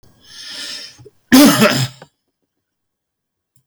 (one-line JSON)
{"cough_length": "3.7 s", "cough_amplitude": 32768, "cough_signal_mean_std_ratio": 0.35, "survey_phase": "beta (2021-08-13 to 2022-03-07)", "age": "65+", "gender": "Male", "wearing_mask": "No", "symptom_none": true, "smoker_status": "Ex-smoker", "respiratory_condition_asthma": false, "respiratory_condition_other": false, "recruitment_source": "REACT", "submission_delay": "3 days", "covid_test_result": "Negative", "covid_test_method": "RT-qPCR", "influenza_a_test_result": "Negative", "influenza_b_test_result": "Negative"}